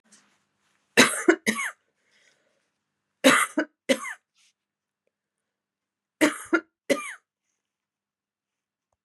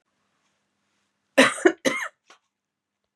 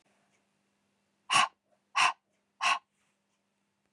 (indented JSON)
{
  "three_cough_length": "9.0 s",
  "three_cough_amplitude": 31514,
  "three_cough_signal_mean_std_ratio": 0.26,
  "cough_length": "3.2 s",
  "cough_amplitude": 25840,
  "cough_signal_mean_std_ratio": 0.25,
  "exhalation_length": "3.9 s",
  "exhalation_amplitude": 9213,
  "exhalation_signal_mean_std_ratio": 0.28,
  "survey_phase": "beta (2021-08-13 to 2022-03-07)",
  "age": "45-64",
  "gender": "Female",
  "wearing_mask": "No",
  "symptom_cough_any": true,
  "symptom_runny_or_blocked_nose": true,
  "symptom_sore_throat": true,
  "symptom_headache": true,
  "smoker_status": "Never smoked",
  "respiratory_condition_asthma": false,
  "respiratory_condition_other": false,
  "recruitment_source": "Test and Trace",
  "submission_delay": "2 days",
  "covid_test_result": "Positive",
  "covid_test_method": "LFT"
}